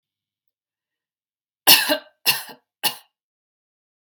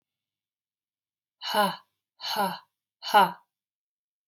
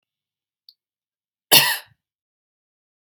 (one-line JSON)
{"three_cough_length": "4.1 s", "three_cough_amplitude": 32768, "three_cough_signal_mean_std_ratio": 0.24, "exhalation_length": "4.3 s", "exhalation_amplitude": 15228, "exhalation_signal_mean_std_ratio": 0.31, "cough_length": "3.1 s", "cough_amplitude": 32768, "cough_signal_mean_std_ratio": 0.2, "survey_phase": "beta (2021-08-13 to 2022-03-07)", "age": "18-44", "gender": "Female", "wearing_mask": "No", "symptom_fatigue": true, "symptom_headache": true, "smoker_status": "Never smoked", "respiratory_condition_asthma": false, "respiratory_condition_other": false, "recruitment_source": "REACT", "submission_delay": "1 day", "covid_test_result": "Negative", "covid_test_method": "RT-qPCR", "influenza_a_test_result": "Negative", "influenza_b_test_result": "Negative"}